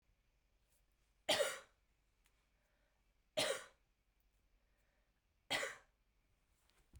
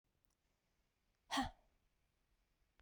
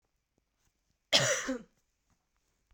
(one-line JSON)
{"three_cough_length": "7.0 s", "three_cough_amplitude": 2949, "three_cough_signal_mean_std_ratio": 0.27, "exhalation_length": "2.8 s", "exhalation_amplitude": 1266, "exhalation_signal_mean_std_ratio": 0.22, "cough_length": "2.7 s", "cough_amplitude": 10792, "cough_signal_mean_std_ratio": 0.29, "survey_phase": "beta (2021-08-13 to 2022-03-07)", "age": "18-44", "gender": "Female", "wearing_mask": "No", "symptom_runny_or_blocked_nose": true, "symptom_sore_throat": true, "smoker_status": "Never smoked", "respiratory_condition_asthma": false, "respiratory_condition_other": false, "recruitment_source": "Test and Trace", "submission_delay": "1 day", "covid_test_result": "Positive", "covid_test_method": "RT-qPCR"}